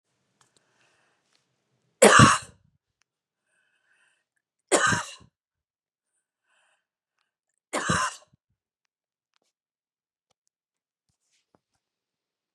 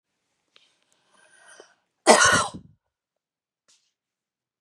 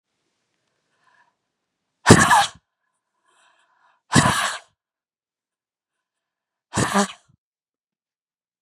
{"three_cough_length": "12.5 s", "three_cough_amplitude": 29030, "three_cough_signal_mean_std_ratio": 0.19, "cough_length": "4.6 s", "cough_amplitude": 32727, "cough_signal_mean_std_ratio": 0.23, "exhalation_length": "8.6 s", "exhalation_amplitude": 32768, "exhalation_signal_mean_std_ratio": 0.25, "survey_phase": "beta (2021-08-13 to 2022-03-07)", "age": "45-64", "gender": "Female", "wearing_mask": "No", "symptom_other": true, "smoker_status": "Never smoked", "respiratory_condition_asthma": false, "respiratory_condition_other": false, "recruitment_source": "REACT", "submission_delay": "2 days", "covid_test_result": "Negative", "covid_test_method": "RT-qPCR", "influenza_a_test_result": "Negative", "influenza_b_test_result": "Negative"}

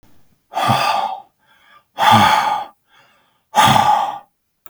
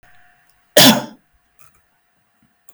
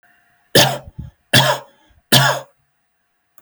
{"exhalation_length": "4.7 s", "exhalation_amplitude": 32768, "exhalation_signal_mean_std_ratio": 0.53, "cough_length": "2.7 s", "cough_amplitude": 32768, "cough_signal_mean_std_ratio": 0.25, "three_cough_length": "3.4 s", "three_cough_amplitude": 32768, "three_cough_signal_mean_std_ratio": 0.37, "survey_phase": "beta (2021-08-13 to 2022-03-07)", "age": "18-44", "gender": "Male", "wearing_mask": "No", "symptom_none": true, "smoker_status": "Never smoked", "respiratory_condition_asthma": true, "respiratory_condition_other": false, "recruitment_source": "REACT", "submission_delay": "1 day", "covid_test_result": "Negative", "covid_test_method": "RT-qPCR", "influenza_a_test_result": "Negative", "influenza_b_test_result": "Negative"}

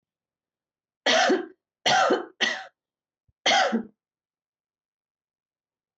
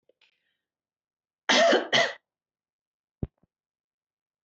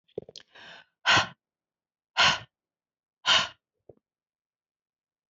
{"three_cough_length": "6.0 s", "three_cough_amplitude": 13601, "three_cough_signal_mean_std_ratio": 0.38, "cough_length": "4.4 s", "cough_amplitude": 12990, "cough_signal_mean_std_ratio": 0.28, "exhalation_length": "5.3 s", "exhalation_amplitude": 13466, "exhalation_signal_mean_std_ratio": 0.27, "survey_phase": "beta (2021-08-13 to 2022-03-07)", "age": "45-64", "gender": "Female", "wearing_mask": "No", "symptom_none": true, "smoker_status": "Never smoked", "respiratory_condition_asthma": false, "respiratory_condition_other": false, "recruitment_source": "Test and Trace", "submission_delay": "3 days", "covid_test_result": "Negative", "covid_test_method": "RT-qPCR"}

